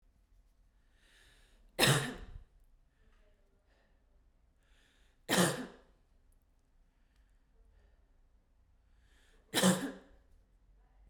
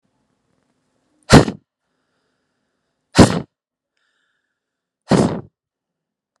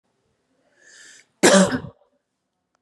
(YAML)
three_cough_length: 11.1 s
three_cough_amplitude: 7302
three_cough_signal_mean_std_ratio: 0.26
exhalation_length: 6.4 s
exhalation_amplitude: 32768
exhalation_signal_mean_std_ratio: 0.22
cough_length: 2.8 s
cough_amplitude: 32398
cough_signal_mean_std_ratio: 0.28
survey_phase: beta (2021-08-13 to 2022-03-07)
age: 18-44
gender: Female
wearing_mask: 'No'
symptom_none: true
symptom_onset: 7 days
smoker_status: Never smoked
respiratory_condition_asthma: false
respiratory_condition_other: false
recruitment_source: REACT
submission_delay: 2 days
covid_test_result: Negative
covid_test_method: RT-qPCR